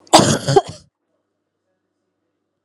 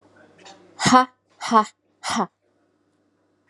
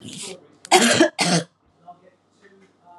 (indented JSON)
{
  "cough_length": "2.6 s",
  "cough_amplitude": 32768,
  "cough_signal_mean_std_ratio": 0.3,
  "exhalation_length": "3.5 s",
  "exhalation_amplitude": 31221,
  "exhalation_signal_mean_std_ratio": 0.31,
  "three_cough_length": "3.0 s",
  "three_cough_amplitude": 32165,
  "three_cough_signal_mean_std_ratio": 0.39,
  "survey_phase": "alpha (2021-03-01 to 2021-08-12)",
  "age": "18-44",
  "gender": "Female",
  "wearing_mask": "No",
  "symptom_cough_any": true,
  "symptom_fatigue": true,
  "symptom_headache": true,
  "symptom_change_to_sense_of_smell_or_taste": true,
  "symptom_loss_of_taste": true,
  "symptom_onset": "7 days",
  "smoker_status": "Ex-smoker",
  "respiratory_condition_asthma": false,
  "respiratory_condition_other": false,
  "recruitment_source": "Test and Trace",
  "submission_delay": "2 days",
  "covid_test_result": "Positive",
  "covid_test_method": "RT-qPCR",
  "covid_ct_value": 15.2,
  "covid_ct_gene": "ORF1ab gene",
  "covid_ct_mean": 15.5,
  "covid_viral_load": "8200000 copies/ml",
  "covid_viral_load_category": "High viral load (>1M copies/ml)"
}